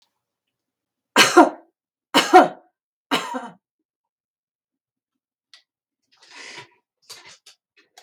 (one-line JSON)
{"three_cough_length": "8.0 s", "three_cough_amplitude": 32768, "three_cough_signal_mean_std_ratio": 0.22, "survey_phase": "beta (2021-08-13 to 2022-03-07)", "age": "65+", "gender": "Female", "wearing_mask": "No", "symptom_none": true, "smoker_status": "Ex-smoker", "respiratory_condition_asthma": false, "respiratory_condition_other": false, "recruitment_source": "REACT", "submission_delay": "6 days", "covid_test_result": "Negative", "covid_test_method": "RT-qPCR", "influenza_a_test_result": "Negative", "influenza_b_test_result": "Negative"}